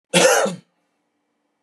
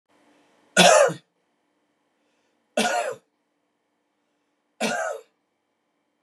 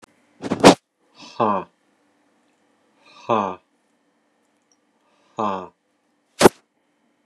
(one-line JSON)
{"cough_length": "1.6 s", "cough_amplitude": 27223, "cough_signal_mean_std_ratio": 0.41, "three_cough_length": "6.2 s", "three_cough_amplitude": 26703, "three_cough_signal_mean_std_ratio": 0.29, "exhalation_length": "7.3 s", "exhalation_amplitude": 32768, "exhalation_signal_mean_std_ratio": 0.22, "survey_phase": "beta (2021-08-13 to 2022-03-07)", "age": "45-64", "gender": "Male", "wearing_mask": "No", "symptom_none": true, "smoker_status": "Ex-smoker", "respiratory_condition_asthma": false, "respiratory_condition_other": false, "recruitment_source": "REACT", "submission_delay": "3 days", "covid_test_result": "Negative", "covid_test_method": "RT-qPCR", "influenza_a_test_result": "Negative", "influenza_b_test_result": "Negative"}